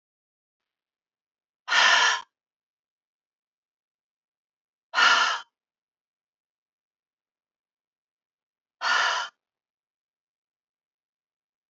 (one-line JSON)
{"exhalation_length": "11.7 s", "exhalation_amplitude": 17681, "exhalation_signal_mean_std_ratio": 0.26, "survey_phase": "beta (2021-08-13 to 2022-03-07)", "age": "45-64", "gender": "Female", "wearing_mask": "No", "symptom_cough_any": true, "symptom_runny_or_blocked_nose": true, "symptom_sore_throat": true, "symptom_fatigue": true, "symptom_headache": true, "symptom_other": true, "smoker_status": "Never smoked", "respiratory_condition_asthma": false, "respiratory_condition_other": false, "recruitment_source": "Test and Trace", "submission_delay": "1 day", "covid_test_result": "Positive", "covid_test_method": "RT-qPCR", "covid_ct_value": 23.4, "covid_ct_gene": "ORF1ab gene"}